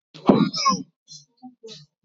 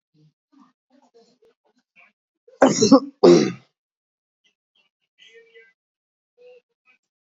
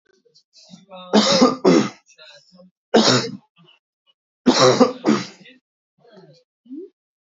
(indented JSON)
{
  "exhalation_length": "2.0 s",
  "exhalation_amplitude": 27026,
  "exhalation_signal_mean_std_ratio": 0.38,
  "cough_length": "7.3 s",
  "cough_amplitude": 27355,
  "cough_signal_mean_std_ratio": 0.23,
  "three_cough_length": "7.3 s",
  "three_cough_amplitude": 29897,
  "three_cough_signal_mean_std_ratio": 0.39,
  "survey_phase": "beta (2021-08-13 to 2022-03-07)",
  "age": "18-44",
  "gender": "Male",
  "wearing_mask": "No",
  "symptom_none": true,
  "smoker_status": "Never smoked",
  "respiratory_condition_asthma": false,
  "respiratory_condition_other": false,
  "recruitment_source": "REACT",
  "submission_delay": "3 days",
  "covid_test_result": "Negative",
  "covid_test_method": "RT-qPCR",
  "influenza_a_test_result": "Negative",
  "influenza_b_test_result": "Negative"
}